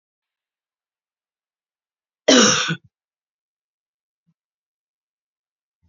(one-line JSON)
{"cough_length": "5.9 s", "cough_amplitude": 28600, "cough_signal_mean_std_ratio": 0.21, "survey_phase": "beta (2021-08-13 to 2022-03-07)", "age": "45-64", "gender": "Female", "wearing_mask": "No", "symptom_none": true, "smoker_status": "Never smoked", "respiratory_condition_asthma": false, "respiratory_condition_other": false, "recruitment_source": "REACT", "submission_delay": "4 days", "covid_test_result": "Negative", "covid_test_method": "RT-qPCR", "influenza_a_test_result": "Negative", "influenza_b_test_result": "Negative"}